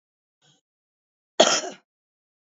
{"cough_length": "2.5 s", "cough_amplitude": 28864, "cough_signal_mean_std_ratio": 0.22, "survey_phase": "alpha (2021-03-01 to 2021-08-12)", "age": "45-64", "gender": "Female", "wearing_mask": "No", "symptom_none": true, "smoker_status": "Current smoker (11 or more cigarettes per day)", "respiratory_condition_asthma": false, "respiratory_condition_other": false, "recruitment_source": "REACT", "submission_delay": "1 day", "covid_test_result": "Negative", "covid_test_method": "RT-qPCR"}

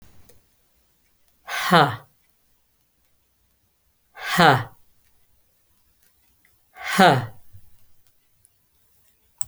{"exhalation_length": "9.5 s", "exhalation_amplitude": 32768, "exhalation_signal_mean_std_ratio": 0.26, "survey_phase": "beta (2021-08-13 to 2022-03-07)", "age": "45-64", "gender": "Female", "wearing_mask": "No", "symptom_none": true, "smoker_status": "Never smoked", "respiratory_condition_asthma": false, "respiratory_condition_other": false, "recruitment_source": "REACT", "submission_delay": "1 day", "covid_test_result": "Negative", "covid_test_method": "RT-qPCR"}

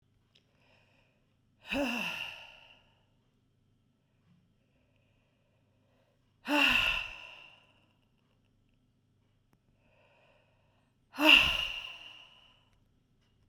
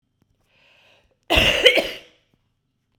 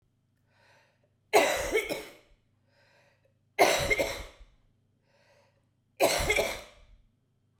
{"exhalation_length": "13.5 s", "exhalation_amplitude": 12354, "exhalation_signal_mean_std_ratio": 0.27, "cough_length": "3.0 s", "cough_amplitude": 32768, "cough_signal_mean_std_ratio": 0.33, "three_cough_length": "7.6 s", "three_cough_amplitude": 15065, "three_cough_signal_mean_std_ratio": 0.37, "survey_phase": "beta (2021-08-13 to 2022-03-07)", "age": "45-64", "gender": "Female", "wearing_mask": "No", "symptom_cough_any": true, "smoker_status": "Never smoked", "respiratory_condition_asthma": true, "respiratory_condition_other": false, "recruitment_source": "REACT", "submission_delay": "2 days", "covid_test_result": "Negative", "covid_test_method": "RT-qPCR"}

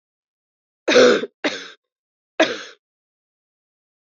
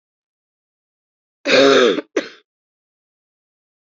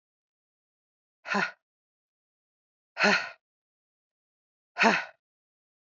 {"three_cough_length": "4.0 s", "three_cough_amplitude": 27737, "three_cough_signal_mean_std_ratio": 0.3, "cough_length": "3.8 s", "cough_amplitude": 27797, "cough_signal_mean_std_ratio": 0.32, "exhalation_length": "6.0 s", "exhalation_amplitude": 12882, "exhalation_signal_mean_std_ratio": 0.26, "survey_phase": "beta (2021-08-13 to 2022-03-07)", "age": "18-44", "gender": "Female", "wearing_mask": "No", "symptom_cough_any": true, "symptom_runny_or_blocked_nose": true, "symptom_shortness_of_breath": true, "symptom_sore_throat": true, "symptom_abdominal_pain": true, "symptom_fatigue": true, "symptom_headache": true, "symptom_change_to_sense_of_smell_or_taste": true, "symptom_other": true, "symptom_onset": "4 days", "smoker_status": "Ex-smoker", "respiratory_condition_asthma": false, "respiratory_condition_other": false, "recruitment_source": "Test and Trace", "submission_delay": "3 days", "covid_test_result": "Positive", "covid_test_method": "RT-qPCR", "covid_ct_value": 27.5, "covid_ct_gene": "ORF1ab gene", "covid_ct_mean": 28.3, "covid_viral_load": "510 copies/ml", "covid_viral_load_category": "Minimal viral load (< 10K copies/ml)"}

